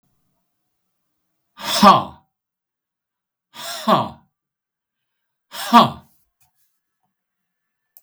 {"exhalation_length": "8.0 s", "exhalation_amplitude": 32768, "exhalation_signal_mean_std_ratio": 0.24, "survey_phase": "beta (2021-08-13 to 2022-03-07)", "age": "65+", "gender": "Male", "wearing_mask": "No", "symptom_none": true, "smoker_status": "Ex-smoker", "respiratory_condition_asthma": false, "respiratory_condition_other": false, "recruitment_source": "REACT", "submission_delay": "2 days", "covid_test_result": "Negative", "covid_test_method": "RT-qPCR", "influenza_a_test_result": "Negative", "influenza_b_test_result": "Negative"}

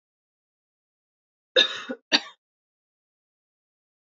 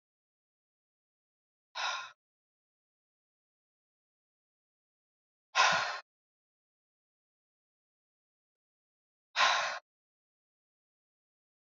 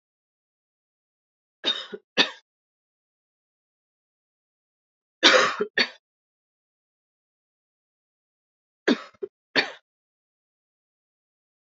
{"cough_length": "4.2 s", "cough_amplitude": 19320, "cough_signal_mean_std_ratio": 0.19, "exhalation_length": "11.6 s", "exhalation_amplitude": 7290, "exhalation_signal_mean_std_ratio": 0.22, "three_cough_length": "11.6 s", "three_cough_amplitude": 28304, "three_cough_signal_mean_std_ratio": 0.21, "survey_phase": "beta (2021-08-13 to 2022-03-07)", "age": "45-64", "gender": "Female", "wearing_mask": "No", "symptom_cough_any": true, "symptom_runny_or_blocked_nose": true, "symptom_sore_throat": true, "symptom_fatigue": true, "symptom_change_to_sense_of_smell_or_taste": true, "symptom_onset": "5 days", "smoker_status": "Never smoked", "respiratory_condition_asthma": false, "respiratory_condition_other": false, "recruitment_source": "Test and Trace", "submission_delay": "2 days", "covid_test_result": "Positive", "covid_test_method": "RT-qPCR", "covid_ct_value": 27.0, "covid_ct_gene": "N gene"}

